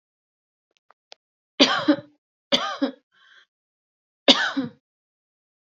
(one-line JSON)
{"three_cough_length": "5.7 s", "three_cough_amplitude": 30894, "three_cough_signal_mean_std_ratio": 0.28, "survey_phase": "beta (2021-08-13 to 2022-03-07)", "age": "45-64", "gender": "Female", "wearing_mask": "No", "symptom_cough_any": true, "symptom_fatigue": true, "symptom_other": true, "symptom_onset": "11 days", "smoker_status": "Never smoked", "respiratory_condition_asthma": false, "respiratory_condition_other": false, "recruitment_source": "REACT", "submission_delay": "1 day", "covid_test_result": "Negative", "covid_test_method": "RT-qPCR", "influenza_a_test_result": "Unknown/Void", "influenza_b_test_result": "Unknown/Void"}